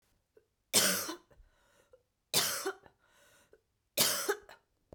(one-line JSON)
{"three_cough_length": "4.9 s", "three_cough_amplitude": 11974, "three_cough_signal_mean_std_ratio": 0.37, "survey_phase": "beta (2021-08-13 to 2022-03-07)", "age": "45-64", "gender": "Female", "wearing_mask": "No", "symptom_cough_any": true, "symptom_new_continuous_cough": true, "symptom_runny_or_blocked_nose": true, "symptom_shortness_of_breath": true, "symptom_fatigue": true, "symptom_onset": "4 days", "smoker_status": "Ex-smoker", "respiratory_condition_asthma": true, "respiratory_condition_other": false, "recruitment_source": "Test and Trace", "submission_delay": "1 day", "covid_test_result": "Negative", "covid_test_method": "RT-qPCR"}